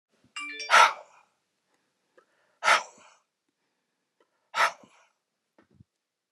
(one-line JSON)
{"exhalation_length": "6.3 s", "exhalation_amplitude": 18130, "exhalation_signal_mean_std_ratio": 0.24, "survey_phase": "beta (2021-08-13 to 2022-03-07)", "age": "45-64", "gender": "Male", "wearing_mask": "No", "symptom_none": true, "smoker_status": "Never smoked", "respiratory_condition_asthma": false, "respiratory_condition_other": false, "recruitment_source": "REACT", "submission_delay": "2 days", "covid_test_result": "Negative", "covid_test_method": "RT-qPCR"}